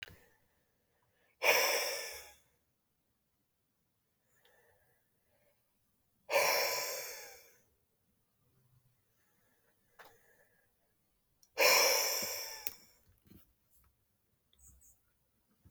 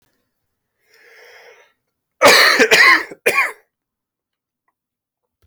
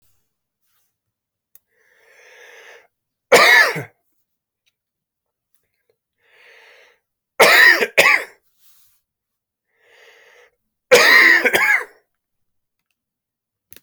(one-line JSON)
{"exhalation_length": "15.7 s", "exhalation_amplitude": 7991, "exhalation_signal_mean_std_ratio": 0.31, "cough_length": "5.5 s", "cough_amplitude": 31514, "cough_signal_mean_std_ratio": 0.35, "three_cough_length": "13.8 s", "three_cough_amplitude": 32767, "three_cough_signal_mean_std_ratio": 0.31, "survey_phase": "alpha (2021-03-01 to 2021-08-12)", "age": "18-44", "gender": "Male", "wearing_mask": "No", "symptom_cough_any": true, "symptom_shortness_of_breath": true, "symptom_fatigue": true, "symptom_fever_high_temperature": true, "symptom_headache": true, "symptom_onset": "3 days", "smoker_status": "Never smoked", "respiratory_condition_asthma": false, "respiratory_condition_other": false, "recruitment_source": "Test and Trace", "submission_delay": "1 day", "covid_test_result": "Positive", "covid_test_method": "RT-qPCR", "covid_ct_value": 15.3, "covid_ct_gene": "ORF1ab gene", "covid_ct_mean": 16.6, "covid_viral_load": "3700000 copies/ml", "covid_viral_load_category": "High viral load (>1M copies/ml)"}